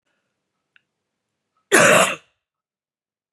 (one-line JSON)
{"cough_length": "3.3 s", "cough_amplitude": 31669, "cough_signal_mean_std_ratio": 0.28, "survey_phase": "beta (2021-08-13 to 2022-03-07)", "age": "45-64", "gender": "Female", "wearing_mask": "No", "symptom_none": true, "smoker_status": "Never smoked", "respiratory_condition_asthma": false, "respiratory_condition_other": false, "recruitment_source": "REACT", "submission_delay": "2 days", "covid_test_result": "Negative", "covid_test_method": "RT-qPCR", "influenza_a_test_result": "Negative", "influenza_b_test_result": "Negative"}